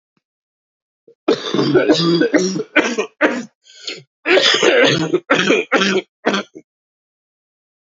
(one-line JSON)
{"cough_length": "7.9 s", "cough_amplitude": 32079, "cough_signal_mean_std_ratio": 0.57, "survey_phase": "beta (2021-08-13 to 2022-03-07)", "age": "45-64", "gender": "Male", "wearing_mask": "No", "symptom_cough_any": true, "symptom_shortness_of_breath": true, "symptom_sore_throat": true, "symptom_onset": "6 days", "smoker_status": "Never smoked", "respiratory_condition_asthma": false, "respiratory_condition_other": false, "recruitment_source": "Test and Trace", "submission_delay": "2 days", "covid_test_result": "Positive", "covid_test_method": "ePCR"}